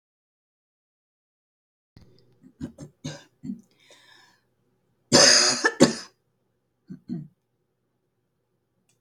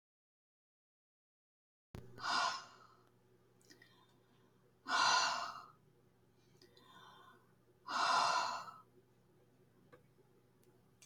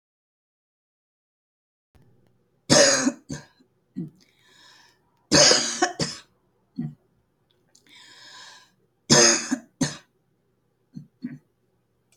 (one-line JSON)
{"cough_length": "9.0 s", "cough_amplitude": 31935, "cough_signal_mean_std_ratio": 0.24, "exhalation_length": "11.1 s", "exhalation_amplitude": 3157, "exhalation_signal_mean_std_ratio": 0.36, "three_cough_length": "12.2 s", "three_cough_amplitude": 27869, "three_cough_signal_mean_std_ratio": 0.29, "survey_phase": "beta (2021-08-13 to 2022-03-07)", "age": "65+", "gender": "Female", "wearing_mask": "No", "symptom_none": true, "smoker_status": "Never smoked", "respiratory_condition_asthma": false, "respiratory_condition_other": false, "recruitment_source": "REACT", "submission_delay": "1 day", "covid_test_result": "Negative", "covid_test_method": "RT-qPCR", "influenza_a_test_result": "Negative", "influenza_b_test_result": "Negative"}